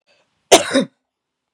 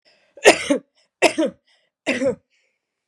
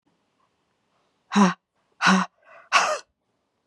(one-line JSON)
{"cough_length": "1.5 s", "cough_amplitude": 32768, "cough_signal_mean_std_ratio": 0.29, "three_cough_length": "3.1 s", "three_cough_amplitude": 32768, "three_cough_signal_mean_std_ratio": 0.34, "exhalation_length": "3.7 s", "exhalation_amplitude": 24920, "exhalation_signal_mean_std_ratio": 0.34, "survey_phase": "beta (2021-08-13 to 2022-03-07)", "age": "45-64", "gender": "Female", "wearing_mask": "No", "symptom_cough_any": true, "symptom_runny_or_blocked_nose": true, "symptom_abdominal_pain": true, "symptom_fatigue": true, "symptom_headache": true, "symptom_other": true, "symptom_onset": "4 days", "smoker_status": "Never smoked", "respiratory_condition_asthma": true, "respiratory_condition_other": false, "recruitment_source": "Test and Trace", "submission_delay": "2 days", "covid_test_result": "Positive", "covid_test_method": "RT-qPCR", "covid_ct_value": 12.9, "covid_ct_gene": "ORF1ab gene", "covid_ct_mean": 13.1, "covid_viral_load": "52000000 copies/ml", "covid_viral_load_category": "High viral load (>1M copies/ml)"}